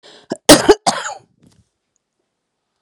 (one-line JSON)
{"cough_length": "2.8 s", "cough_amplitude": 32768, "cough_signal_mean_std_ratio": 0.26, "survey_phase": "beta (2021-08-13 to 2022-03-07)", "age": "45-64", "gender": "Female", "wearing_mask": "No", "symptom_cough_any": true, "symptom_runny_or_blocked_nose": true, "symptom_headache": true, "smoker_status": "Ex-smoker", "respiratory_condition_asthma": false, "respiratory_condition_other": false, "recruitment_source": "REACT", "submission_delay": "1 day", "covid_test_result": "Negative", "covid_test_method": "RT-qPCR"}